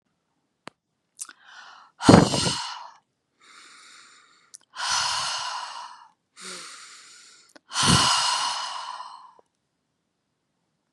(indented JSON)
{
  "exhalation_length": "10.9 s",
  "exhalation_amplitude": 32767,
  "exhalation_signal_mean_std_ratio": 0.35,
  "survey_phase": "beta (2021-08-13 to 2022-03-07)",
  "age": "45-64",
  "gender": "Female",
  "wearing_mask": "No",
  "symptom_none": true,
  "smoker_status": "Ex-smoker",
  "respiratory_condition_asthma": false,
  "respiratory_condition_other": false,
  "recruitment_source": "REACT",
  "submission_delay": "1 day",
  "covid_test_result": "Negative",
  "covid_test_method": "RT-qPCR",
  "influenza_a_test_result": "Negative",
  "influenza_b_test_result": "Negative"
}